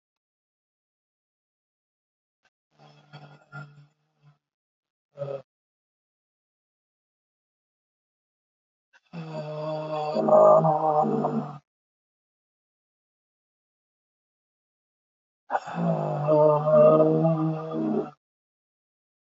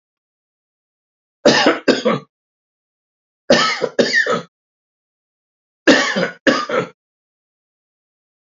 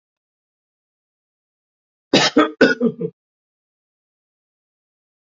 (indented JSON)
{
  "exhalation_length": "19.3 s",
  "exhalation_amplitude": 16712,
  "exhalation_signal_mean_std_ratio": 0.36,
  "three_cough_length": "8.5 s",
  "three_cough_amplitude": 29980,
  "three_cough_signal_mean_std_ratio": 0.38,
  "cough_length": "5.2 s",
  "cough_amplitude": 28294,
  "cough_signal_mean_std_ratio": 0.26,
  "survey_phase": "beta (2021-08-13 to 2022-03-07)",
  "age": "65+",
  "gender": "Male",
  "wearing_mask": "No",
  "symptom_sore_throat": true,
  "symptom_onset": "12 days",
  "smoker_status": "Ex-smoker",
  "respiratory_condition_asthma": false,
  "respiratory_condition_other": false,
  "recruitment_source": "REACT",
  "submission_delay": "2 days",
  "covid_test_result": "Negative",
  "covid_test_method": "RT-qPCR",
  "influenza_a_test_result": "Negative",
  "influenza_b_test_result": "Negative"
}